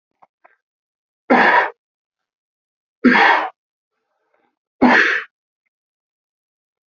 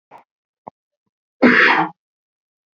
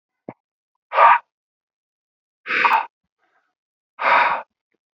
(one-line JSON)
{"three_cough_length": "6.9 s", "three_cough_amplitude": 28791, "three_cough_signal_mean_std_ratio": 0.34, "cough_length": "2.7 s", "cough_amplitude": 28536, "cough_signal_mean_std_ratio": 0.33, "exhalation_length": "4.9 s", "exhalation_amplitude": 27864, "exhalation_signal_mean_std_ratio": 0.34, "survey_phase": "beta (2021-08-13 to 2022-03-07)", "age": "18-44", "gender": "Male", "wearing_mask": "No", "symptom_none": true, "smoker_status": "Ex-smoker", "respiratory_condition_asthma": false, "respiratory_condition_other": false, "recruitment_source": "Test and Trace", "submission_delay": "0 days", "covid_test_result": "Negative", "covid_test_method": "LFT"}